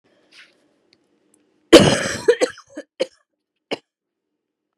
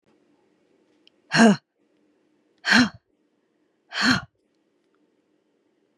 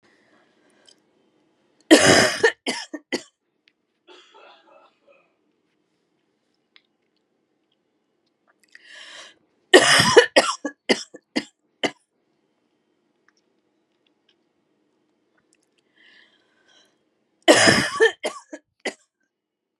{"cough_length": "4.8 s", "cough_amplitude": 32768, "cough_signal_mean_std_ratio": 0.24, "exhalation_length": "6.0 s", "exhalation_amplitude": 24888, "exhalation_signal_mean_std_ratio": 0.26, "three_cough_length": "19.8 s", "three_cough_amplitude": 32768, "three_cough_signal_mean_std_ratio": 0.25, "survey_phase": "beta (2021-08-13 to 2022-03-07)", "age": "18-44", "gender": "Female", "wearing_mask": "No", "symptom_cough_any": true, "symptom_runny_or_blocked_nose": true, "symptom_sore_throat": true, "symptom_fatigue": true, "symptom_fever_high_temperature": true, "symptom_headache": true, "symptom_change_to_sense_of_smell_or_taste": true, "symptom_other": true, "smoker_status": "Never smoked", "respiratory_condition_asthma": false, "respiratory_condition_other": false, "recruitment_source": "Test and Trace", "submission_delay": "1 day", "covid_test_result": "Positive", "covid_test_method": "LFT"}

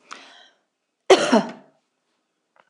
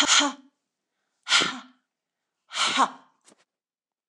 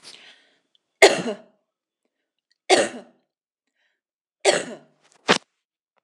{"cough_length": "2.7 s", "cough_amplitude": 26027, "cough_signal_mean_std_ratio": 0.26, "exhalation_length": "4.1 s", "exhalation_amplitude": 19173, "exhalation_signal_mean_std_ratio": 0.37, "three_cough_length": "6.0 s", "three_cough_amplitude": 26028, "three_cough_signal_mean_std_ratio": 0.24, "survey_phase": "beta (2021-08-13 to 2022-03-07)", "age": "65+", "gender": "Female", "wearing_mask": "No", "symptom_none": true, "smoker_status": "Ex-smoker", "respiratory_condition_asthma": false, "respiratory_condition_other": false, "recruitment_source": "REACT", "submission_delay": "2 days", "covid_test_result": "Negative", "covid_test_method": "RT-qPCR", "influenza_a_test_result": "Negative", "influenza_b_test_result": "Negative"}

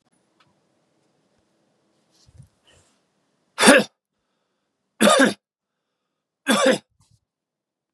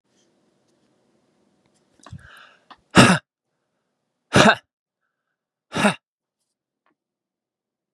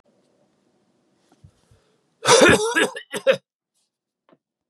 {"three_cough_length": "7.9 s", "three_cough_amplitude": 32768, "three_cough_signal_mean_std_ratio": 0.26, "exhalation_length": "7.9 s", "exhalation_amplitude": 32768, "exhalation_signal_mean_std_ratio": 0.21, "cough_length": "4.7 s", "cough_amplitude": 28689, "cough_signal_mean_std_ratio": 0.31, "survey_phase": "beta (2021-08-13 to 2022-03-07)", "age": "45-64", "gender": "Male", "wearing_mask": "No", "symptom_none": true, "symptom_onset": "2 days", "smoker_status": "Ex-smoker", "respiratory_condition_asthma": false, "respiratory_condition_other": false, "recruitment_source": "REACT", "submission_delay": "1 day", "covid_test_result": "Negative", "covid_test_method": "RT-qPCR"}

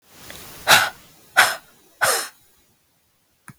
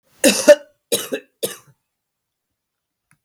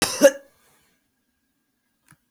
{"exhalation_length": "3.6 s", "exhalation_amplitude": 32768, "exhalation_signal_mean_std_ratio": 0.33, "three_cough_length": "3.2 s", "three_cough_amplitude": 32768, "three_cough_signal_mean_std_ratio": 0.26, "cough_length": "2.3 s", "cough_amplitude": 22098, "cough_signal_mean_std_ratio": 0.21, "survey_phase": "beta (2021-08-13 to 2022-03-07)", "age": "18-44", "gender": "Female", "wearing_mask": "No", "symptom_cough_any": true, "symptom_sore_throat": true, "symptom_other": true, "smoker_status": "Never smoked", "respiratory_condition_asthma": false, "respiratory_condition_other": false, "recruitment_source": "Test and Trace", "submission_delay": "1 day", "covid_test_result": "Positive", "covid_test_method": "ePCR"}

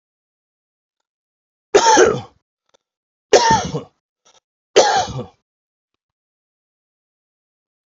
{"three_cough_length": "7.9 s", "three_cough_amplitude": 32768, "three_cough_signal_mean_std_ratio": 0.3, "survey_phase": "alpha (2021-03-01 to 2021-08-12)", "age": "45-64", "gender": "Male", "wearing_mask": "No", "symptom_none": true, "smoker_status": "Never smoked", "respiratory_condition_asthma": false, "respiratory_condition_other": false, "recruitment_source": "REACT", "submission_delay": "2 days", "covid_test_result": "Negative", "covid_test_method": "RT-qPCR"}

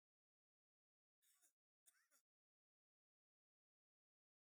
{"cough_length": "4.4 s", "cough_amplitude": 52, "cough_signal_mean_std_ratio": 0.23, "survey_phase": "beta (2021-08-13 to 2022-03-07)", "age": "65+", "gender": "Male", "wearing_mask": "No", "symptom_runny_or_blocked_nose": true, "smoker_status": "Ex-smoker", "respiratory_condition_asthma": false, "respiratory_condition_other": true, "recruitment_source": "REACT", "submission_delay": "1 day", "covid_test_result": "Negative", "covid_test_method": "RT-qPCR", "influenza_a_test_result": "Negative", "influenza_b_test_result": "Negative"}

